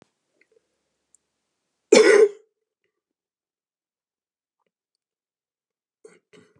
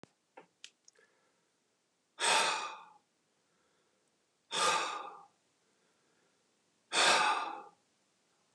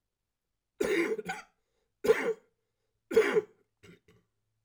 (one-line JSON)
{"cough_length": "6.6 s", "cough_amplitude": 29975, "cough_signal_mean_std_ratio": 0.19, "exhalation_length": "8.5 s", "exhalation_amplitude": 6163, "exhalation_signal_mean_std_ratio": 0.35, "three_cough_length": "4.6 s", "three_cough_amplitude": 8104, "three_cough_signal_mean_std_ratio": 0.36, "survey_phase": "beta (2021-08-13 to 2022-03-07)", "age": "45-64", "gender": "Male", "wearing_mask": "No", "symptom_cough_any": true, "symptom_runny_or_blocked_nose": true, "symptom_sore_throat": true, "symptom_diarrhoea": true, "symptom_fatigue": true, "symptom_fever_high_temperature": true, "symptom_headache": true, "symptom_change_to_sense_of_smell_or_taste": true, "symptom_loss_of_taste": true, "symptom_onset": "3 days", "smoker_status": "Never smoked", "respiratory_condition_asthma": false, "respiratory_condition_other": false, "recruitment_source": "Test and Trace", "submission_delay": "2 days", "covid_test_result": "Positive", "covid_test_method": "RT-qPCR", "covid_ct_value": 22.5, "covid_ct_gene": "ORF1ab gene", "covid_ct_mean": 23.7, "covid_viral_load": "17000 copies/ml", "covid_viral_load_category": "Low viral load (10K-1M copies/ml)"}